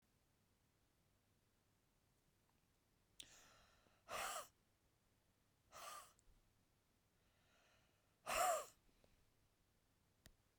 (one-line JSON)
{"exhalation_length": "10.6 s", "exhalation_amplitude": 1345, "exhalation_signal_mean_std_ratio": 0.26, "survey_phase": "beta (2021-08-13 to 2022-03-07)", "age": "65+", "gender": "Female", "wearing_mask": "No", "symptom_none": true, "smoker_status": "Ex-smoker", "respiratory_condition_asthma": false, "respiratory_condition_other": false, "recruitment_source": "REACT", "submission_delay": "1 day", "covid_test_result": "Negative", "covid_test_method": "RT-qPCR", "influenza_a_test_result": "Negative", "influenza_b_test_result": "Negative"}